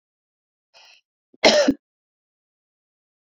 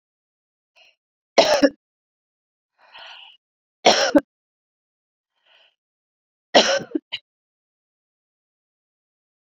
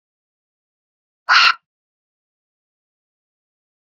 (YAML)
cough_length: 3.2 s
cough_amplitude: 28676
cough_signal_mean_std_ratio: 0.24
three_cough_length: 9.6 s
three_cough_amplitude: 29383
three_cough_signal_mean_std_ratio: 0.23
exhalation_length: 3.8 s
exhalation_amplitude: 29531
exhalation_signal_mean_std_ratio: 0.2
survey_phase: beta (2021-08-13 to 2022-03-07)
age: 45-64
gender: Female
wearing_mask: 'No'
symptom_none: true
smoker_status: Ex-smoker
respiratory_condition_asthma: false
respiratory_condition_other: false
recruitment_source: REACT
submission_delay: 1 day
covid_test_result: Negative
covid_test_method: RT-qPCR